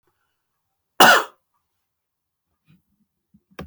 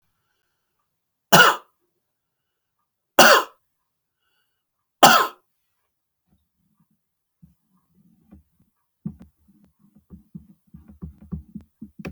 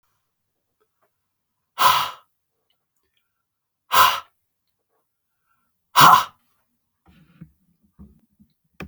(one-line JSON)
{"cough_length": "3.7 s", "cough_amplitude": 30990, "cough_signal_mean_std_ratio": 0.2, "three_cough_length": "12.1 s", "three_cough_amplitude": 32768, "three_cough_signal_mean_std_ratio": 0.2, "exhalation_length": "8.9 s", "exhalation_amplitude": 32768, "exhalation_signal_mean_std_ratio": 0.23, "survey_phase": "beta (2021-08-13 to 2022-03-07)", "age": "65+", "gender": "Male", "wearing_mask": "No", "symptom_none": true, "smoker_status": "Never smoked", "respiratory_condition_asthma": false, "respiratory_condition_other": false, "recruitment_source": "REACT", "submission_delay": "1 day", "covid_test_result": "Negative", "covid_test_method": "RT-qPCR"}